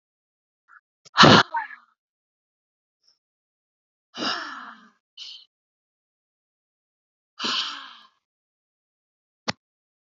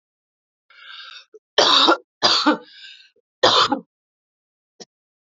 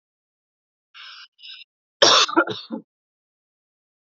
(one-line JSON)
{"exhalation_length": "10.1 s", "exhalation_amplitude": 28512, "exhalation_signal_mean_std_ratio": 0.2, "three_cough_length": "5.3 s", "three_cough_amplitude": 28195, "three_cough_signal_mean_std_ratio": 0.37, "cough_length": "4.0 s", "cough_amplitude": 30246, "cough_signal_mean_std_ratio": 0.27, "survey_phase": "beta (2021-08-13 to 2022-03-07)", "age": "18-44", "gender": "Female", "wearing_mask": "No", "symptom_none": true, "smoker_status": "Never smoked", "respiratory_condition_asthma": false, "respiratory_condition_other": false, "recruitment_source": "REACT", "submission_delay": "3 days", "covid_test_result": "Negative", "covid_test_method": "RT-qPCR", "influenza_a_test_result": "Negative", "influenza_b_test_result": "Negative"}